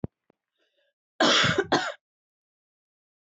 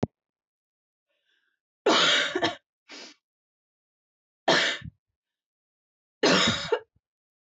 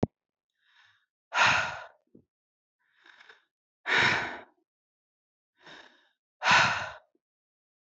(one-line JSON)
{"cough_length": "3.3 s", "cough_amplitude": 13548, "cough_signal_mean_std_ratio": 0.34, "three_cough_length": "7.6 s", "three_cough_amplitude": 12252, "three_cough_signal_mean_std_ratio": 0.35, "exhalation_length": "7.9 s", "exhalation_amplitude": 12710, "exhalation_signal_mean_std_ratio": 0.32, "survey_phase": "beta (2021-08-13 to 2022-03-07)", "age": "18-44", "gender": "Female", "wearing_mask": "No", "symptom_cough_any": true, "symptom_runny_or_blocked_nose": true, "symptom_shortness_of_breath": true, "symptom_sore_throat": true, "symptom_fatigue": true, "symptom_headache": true, "symptom_change_to_sense_of_smell_or_taste": true, "symptom_other": true, "symptom_onset": "7 days", "smoker_status": "Never smoked", "respiratory_condition_asthma": false, "respiratory_condition_other": false, "recruitment_source": "Test and Trace", "submission_delay": "2 days", "covid_test_result": "Positive", "covid_test_method": "RT-qPCR", "covid_ct_value": 19.2, "covid_ct_gene": "ORF1ab gene", "covid_ct_mean": 19.2, "covid_viral_load": "500000 copies/ml", "covid_viral_load_category": "Low viral load (10K-1M copies/ml)"}